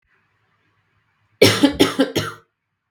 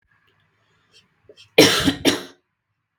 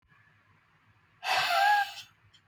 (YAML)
three_cough_length: 2.9 s
three_cough_amplitude: 32768
three_cough_signal_mean_std_ratio: 0.35
cough_length: 3.0 s
cough_amplitude: 32768
cough_signal_mean_std_ratio: 0.3
exhalation_length: 2.5 s
exhalation_amplitude: 5825
exhalation_signal_mean_std_ratio: 0.46
survey_phase: beta (2021-08-13 to 2022-03-07)
age: 18-44
gender: Female
wearing_mask: 'No'
symptom_cough_any: true
symptom_runny_or_blocked_nose: true
smoker_status: Never smoked
respiratory_condition_asthma: false
respiratory_condition_other: false
recruitment_source: Test and Trace
submission_delay: 1 day
covid_test_result: Positive
covid_test_method: RT-qPCR
covid_ct_value: 17.0
covid_ct_gene: ORF1ab gene
covid_ct_mean: 18.1
covid_viral_load: 1100000 copies/ml
covid_viral_load_category: High viral load (>1M copies/ml)